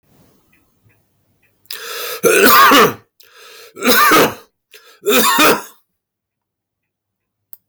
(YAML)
three_cough_length: 7.7 s
three_cough_amplitude: 32768
three_cough_signal_mean_std_ratio: 0.45
survey_phase: beta (2021-08-13 to 2022-03-07)
age: 45-64
gender: Male
wearing_mask: 'No'
symptom_none: true
smoker_status: Ex-smoker
respiratory_condition_asthma: false
respiratory_condition_other: false
recruitment_source: REACT
submission_delay: 2 days
covid_test_result: Negative
covid_test_method: RT-qPCR
influenza_a_test_result: Negative
influenza_b_test_result: Negative